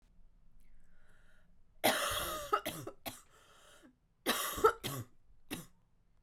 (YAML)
cough_length: 6.2 s
cough_amplitude: 7295
cough_signal_mean_std_ratio: 0.41
survey_phase: beta (2021-08-13 to 2022-03-07)
age: 18-44
gender: Female
wearing_mask: 'No'
symptom_cough_any: true
symptom_runny_or_blocked_nose: true
symptom_shortness_of_breath: true
symptom_headache: true
symptom_change_to_sense_of_smell_or_taste: true
symptom_loss_of_taste: true
smoker_status: Ex-smoker
respiratory_condition_asthma: false
respiratory_condition_other: false
recruitment_source: Test and Trace
submission_delay: 3 days
covid_test_result: Positive
covid_test_method: RT-qPCR